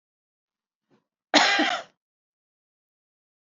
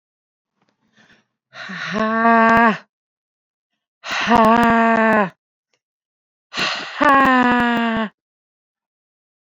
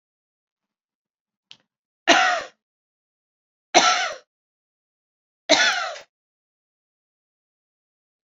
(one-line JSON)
{"cough_length": "3.4 s", "cough_amplitude": 23332, "cough_signal_mean_std_ratio": 0.28, "exhalation_length": "9.5 s", "exhalation_amplitude": 28063, "exhalation_signal_mean_std_ratio": 0.48, "three_cough_length": "8.4 s", "three_cough_amplitude": 29838, "three_cough_signal_mean_std_ratio": 0.27, "survey_phase": "beta (2021-08-13 to 2022-03-07)", "age": "18-44", "gender": "Female", "wearing_mask": "No", "symptom_cough_any": true, "symptom_runny_or_blocked_nose": true, "symptom_shortness_of_breath": true, "symptom_sore_throat": true, "symptom_fatigue": true, "symptom_fever_high_temperature": true, "symptom_headache": true, "symptom_onset": "3 days", "smoker_status": "Current smoker (e-cigarettes or vapes only)", "respiratory_condition_asthma": false, "respiratory_condition_other": true, "recruitment_source": "Test and Trace", "submission_delay": "2 days", "covid_test_result": "Positive", "covid_test_method": "RT-qPCR", "covid_ct_value": 26.8, "covid_ct_gene": "ORF1ab gene"}